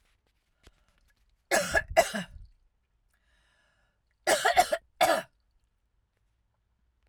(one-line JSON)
{"three_cough_length": "7.1 s", "three_cough_amplitude": 13727, "three_cough_signal_mean_std_ratio": 0.3, "survey_phase": "alpha (2021-03-01 to 2021-08-12)", "age": "45-64", "gender": "Female", "wearing_mask": "No", "symptom_none": true, "smoker_status": "Ex-smoker", "respiratory_condition_asthma": false, "respiratory_condition_other": false, "recruitment_source": "REACT", "submission_delay": "2 days", "covid_test_result": "Negative", "covid_test_method": "RT-qPCR"}